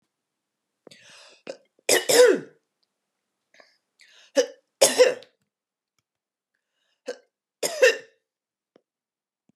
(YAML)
three_cough_length: 9.6 s
three_cough_amplitude: 25551
three_cough_signal_mean_std_ratio: 0.26
survey_phase: beta (2021-08-13 to 2022-03-07)
age: 45-64
gender: Female
wearing_mask: 'No'
symptom_fatigue: true
smoker_status: Never smoked
respiratory_condition_asthma: false
respiratory_condition_other: false
recruitment_source: REACT
submission_delay: 3 days
covid_test_result: Negative
covid_test_method: RT-qPCR